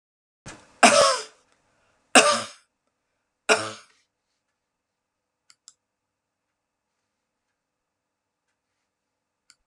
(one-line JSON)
{"three_cough_length": "9.7 s", "three_cough_amplitude": 32018, "three_cough_signal_mean_std_ratio": 0.21, "survey_phase": "beta (2021-08-13 to 2022-03-07)", "age": "65+", "gender": "Female", "wearing_mask": "No", "symptom_none": true, "smoker_status": "Never smoked", "respiratory_condition_asthma": false, "respiratory_condition_other": false, "recruitment_source": "REACT", "submission_delay": "1 day", "covid_test_result": "Negative", "covid_test_method": "RT-qPCR"}